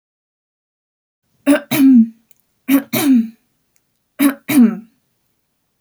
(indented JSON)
{
  "three_cough_length": "5.8 s",
  "three_cough_amplitude": 29691,
  "three_cough_signal_mean_std_ratio": 0.41,
  "survey_phase": "beta (2021-08-13 to 2022-03-07)",
  "age": "18-44",
  "gender": "Female",
  "wearing_mask": "No",
  "symptom_abdominal_pain": true,
  "symptom_fatigue": true,
  "symptom_onset": "12 days",
  "smoker_status": "Never smoked",
  "respiratory_condition_asthma": false,
  "respiratory_condition_other": false,
  "recruitment_source": "REACT",
  "submission_delay": "3 days",
  "covid_test_result": "Negative",
  "covid_test_method": "RT-qPCR"
}